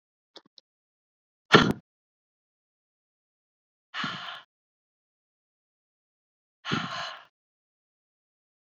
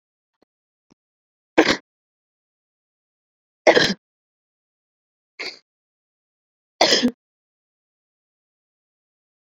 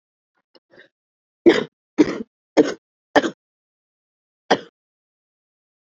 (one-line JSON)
{"exhalation_length": "8.8 s", "exhalation_amplitude": 27472, "exhalation_signal_mean_std_ratio": 0.18, "three_cough_length": "9.6 s", "three_cough_amplitude": 29601, "three_cough_signal_mean_std_ratio": 0.2, "cough_length": "5.9 s", "cough_amplitude": 27909, "cough_signal_mean_std_ratio": 0.23, "survey_phase": "beta (2021-08-13 to 2022-03-07)", "age": "18-44", "gender": "Female", "wearing_mask": "No", "symptom_cough_any": true, "symptom_runny_or_blocked_nose": true, "symptom_fever_high_temperature": true, "symptom_headache": true, "symptom_onset": "2 days", "smoker_status": "Ex-smoker", "respiratory_condition_asthma": false, "respiratory_condition_other": false, "recruitment_source": "Test and Trace", "submission_delay": "1 day", "covid_test_result": "Positive", "covid_test_method": "RT-qPCR", "covid_ct_value": 15.6, "covid_ct_gene": "ORF1ab gene", "covid_ct_mean": 16.0, "covid_viral_load": "5500000 copies/ml", "covid_viral_load_category": "High viral load (>1M copies/ml)"}